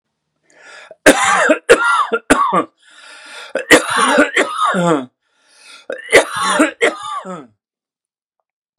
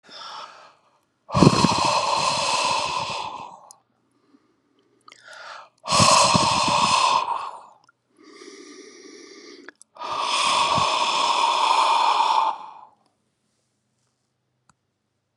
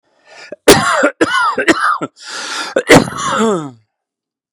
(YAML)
three_cough_length: 8.8 s
three_cough_amplitude: 32768
three_cough_signal_mean_std_ratio: 0.5
exhalation_length: 15.4 s
exhalation_amplitude: 32758
exhalation_signal_mean_std_ratio: 0.55
cough_length: 4.5 s
cough_amplitude: 32768
cough_signal_mean_std_ratio: 0.54
survey_phase: beta (2021-08-13 to 2022-03-07)
age: 65+
gender: Male
wearing_mask: 'No'
symptom_cough_any: true
symptom_runny_or_blocked_nose: true
symptom_sore_throat: true
symptom_fatigue: true
symptom_headache: true
symptom_onset: 5 days
smoker_status: Ex-smoker
respiratory_condition_asthma: false
respiratory_condition_other: false
recruitment_source: Test and Trace
submission_delay: 2 days
covid_test_result: Positive
covid_test_method: RT-qPCR
covid_ct_value: 31.2
covid_ct_gene: ORF1ab gene